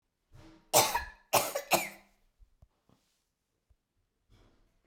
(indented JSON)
{
  "three_cough_length": "4.9 s",
  "three_cough_amplitude": 15184,
  "three_cough_signal_mean_std_ratio": 0.28,
  "survey_phase": "beta (2021-08-13 to 2022-03-07)",
  "age": "45-64",
  "gender": "Female",
  "wearing_mask": "No",
  "symptom_none": true,
  "smoker_status": "Never smoked",
  "respiratory_condition_asthma": false,
  "respiratory_condition_other": false,
  "recruitment_source": "REACT",
  "submission_delay": "3 days",
  "covid_test_result": "Negative",
  "covid_test_method": "RT-qPCR",
  "influenza_a_test_result": "Unknown/Void",
  "influenza_b_test_result": "Unknown/Void"
}